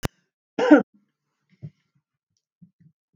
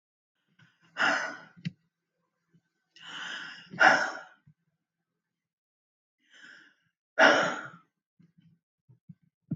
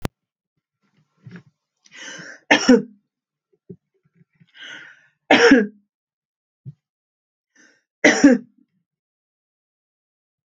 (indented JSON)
{
  "cough_length": "3.2 s",
  "cough_amplitude": 26990,
  "cough_signal_mean_std_ratio": 0.2,
  "exhalation_length": "9.6 s",
  "exhalation_amplitude": 16855,
  "exhalation_signal_mean_std_ratio": 0.27,
  "three_cough_length": "10.5 s",
  "three_cough_amplitude": 32767,
  "three_cough_signal_mean_std_ratio": 0.24,
  "survey_phase": "alpha (2021-03-01 to 2021-08-12)",
  "age": "45-64",
  "gender": "Female",
  "wearing_mask": "No",
  "symptom_none": true,
  "smoker_status": "Never smoked",
  "respiratory_condition_asthma": false,
  "respiratory_condition_other": false,
  "recruitment_source": "REACT",
  "submission_delay": "1 day",
  "covid_test_result": "Negative",
  "covid_test_method": "RT-qPCR"
}